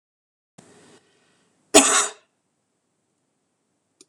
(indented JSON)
{
  "cough_length": "4.1 s",
  "cough_amplitude": 26028,
  "cough_signal_mean_std_ratio": 0.21,
  "survey_phase": "beta (2021-08-13 to 2022-03-07)",
  "age": "45-64",
  "gender": "Female",
  "wearing_mask": "No",
  "symptom_none": true,
  "smoker_status": "Never smoked",
  "respiratory_condition_asthma": false,
  "respiratory_condition_other": false,
  "recruitment_source": "REACT",
  "submission_delay": "1 day",
  "covid_test_result": "Negative",
  "covid_test_method": "RT-qPCR",
  "influenza_a_test_result": "Negative",
  "influenza_b_test_result": "Negative"
}